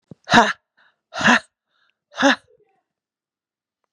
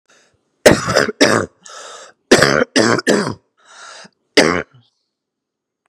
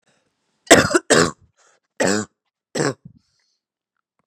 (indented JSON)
{
  "exhalation_length": "3.9 s",
  "exhalation_amplitude": 32767,
  "exhalation_signal_mean_std_ratio": 0.29,
  "three_cough_length": "5.9 s",
  "three_cough_amplitude": 32768,
  "three_cough_signal_mean_std_ratio": 0.4,
  "cough_length": "4.3 s",
  "cough_amplitude": 32768,
  "cough_signal_mean_std_ratio": 0.31,
  "survey_phase": "beta (2021-08-13 to 2022-03-07)",
  "age": "45-64",
  "gender": "Female",
  "wearing_mask": "No",
  "symptom_cough_any": true,
  "symptom_abdominal_pain": true,
  "symptom_fatigue": true,
  "symptom_fever_high_temperature": true,
  "symptom_headache": true,
  "symptom_onset": "12 days",
  "smoker_status": "Never smoked",
  "respiratory_condition_asthma": false,
  "respiratory_condition_other": false,
  "recruitment_source": "REACT",
  "submission_delay": "0 days",
  "covid_test_result": "Positive",
  "covid_test_method": "RT-qPCR",
  "covid_ct_value": 29.0,
  "covid_ct_gene": "E gene"
}